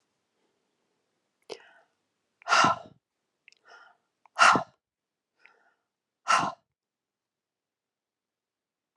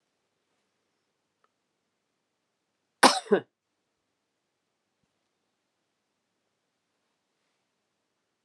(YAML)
exhalation_length: 9.0 s
exhalation_amplitude: 16662
exhalation_signal_mean_std_ratio: 0.22
cough_length: 8.4 s
cough_amplitude: 32199
cough_signal_mean_std_ratio: 0.12
survey_phase: alpha (2021-03-01 to 2021-08-12)
age: 65+
gender: Female
wearing_mask: 'No'
symptom_change_to_sense_of_smell_or_taste: true
smoker_status: Ex-smoker
respiratory_condition_asthma: false
respiratory_condition_other: false
recruitment_source: Test and Trace
submission_delay: 2 days
covid_test_result: Positive
covid_test_method: RT-qPCR
covid_ct_value: 27.2
covid_ct_gene: N gene
covid_ct_mean: 27.4
covid_viral_load: 1000 copies/ml
covid_viral_load_category: Minimal viral load (< 10K copies/ml)